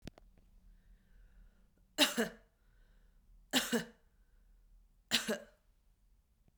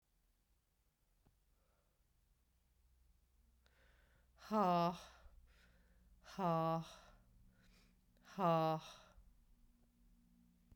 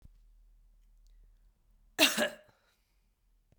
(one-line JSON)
{"three_cough_length": "6.6 s", "three_cough_amplitude": 6908, "three_cough_signal_mean_std_ratio": 0.29, "exhalation_length": "10.8 s", "exhalation_amplitude": 1971, "exhalation_signal_mean_std_ratio": 0.33, "cough_length": "3.6 s", "cough_amplitude": 11793, "cough_signal_mean_std_ratio": 0.24, "survey_phase": "beta (2021-08-13 to 2022-03-07)", "age": "45-64", "gender": "Female", "wearing_mask": "No", "symptom_runny_or_blocked_nose": true, "symptom_fatigue": true, "symptom_fever_high_temperature": true, "symptom_headache": true, "symptom_change_to_sense_of_smell_or_taste": true, "symptom_loss_of_taste": true, "symptom_onset": "3 days", "smoker_status": "Ex-smoker", "respiratory_condition_asthma": false, "respiratory_condition_other": false, "recruitment_source": "Test and Trace", "submission_delay": "2 days", "covid_test_result": "Positive", "covid_test_method": "RT-qPCR", "covid_ct_value": 16.9, "covid_ct_gene": "ORF1ab gene", "covid_ct_mean": 17.4, "covid_viral_load": "2000000 copies/ml", "covid_viral_load_category": "High viral load (>1M copies/ml)"}